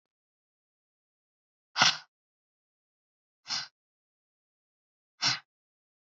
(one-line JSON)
{"exhalation_length": "6.1 s", "exhalation_amplitude": 14366, "exhalation_signal_mean_std_ratio": 0.19, "survey_phase": "beta (2021-08-13 to 2022-03-07)", "age": "18-44", "gender": "Female", "wearing_mask": "No", "symptom_abdominal_pain": true, "smoker_status": "Never smoked", "respiratory_condition_asthma": false, "respiratory_condition_other": false, "recruitment_source": "REACT", "submission_delay": "5 days", "covid_test_result": "Negative", "covid_test_method": "RT-qPCR", "influenza_a_test_result": "Negative", "influenza_b_test_result": "Negative"}